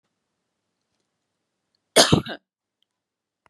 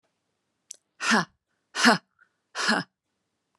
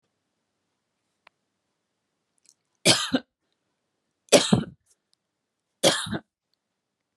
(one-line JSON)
{"cough_length": "3.5 s", "cough_amplitude": 32673, "cough_signal_mean_std_ratio": 0.19, "exhalation_length": "3.6 s", "exhalation_amplitude": 20836, "exhalation_signal_mean_std_ratio": 0.32, "three_cough_length": "7.2 s", "three_cough_amplitude": 26901, "three_cough_signal_mean_std_ratio": 0.23, "survey_phase": "beta (2021-08-13 to 2022-03-07)", "age": "45-64", "gender": "Female", "wearing_mask": "No", "symptom_none": true, "smoker_status": "Never smoked", "respiratory_condition_asthma": false, "respiratory_condition_other": false, "recruitment_source": "REACT", "submission_delay": "1 day", "covid_test_result": "Negative", "covid_test_method": "RT-qPCR"}